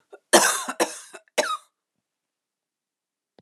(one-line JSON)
{"three_cough_length": "3.4 s", "three_cough_amplitude": 31804, "three_cough_signal_mean_std_ratio": 0.3, "survey_phase": "alpha (2021-03-01 to 2021-08-12)", "age": "45-64", "gender": "Female", "wearing_mask": "No", "symptom_cough_any": true, "symptom_shortness_of_breath": true, "symptom_fatigue": true, "symptom_fever_high_temperature": true, "symptom_change_to_sense_of_smell_or_taste": true, "symptom_loss_of_taste": true, "symptom_onset": "6 days", "smoker_status": "Never smoked", "respiratory_condition_asthma": false, "respiratory_condition_other": false, "recruitment_source": "Test and Trace", "submission_delay": "2 days", "covid_test_result": "Positive", "covid_test_method": "RT-qPCR", "covid_ct_value": 17.7, "covid_ct_gene": "N gene", "covid_ct_mean": 17.7, "covid_viral_load": "1600000 copies/ml", "covid_viral_load_category": "High viral load (>1M copies/ml)"}